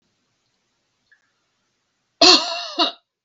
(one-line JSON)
{"cough_length": "3.2 s", "cough_amplitude": 32768, "cough_signal_mean_std_ratio": 0.28, "survey_phase": "beta (2021-08-13 to 2022-03-07)", "age": "65+", "gender": "Female", "wearing_mask": "No", "symptom_none": true, "smoker_status": "Ex-smoker", "respiratory_condition_asthma": false, "respiratory_condition_other": false, "recruitment_source": "REACT", "submission_delay": "1 day", "covid_test_result": "Negative", "covid_test_method": "RT-qPCR"}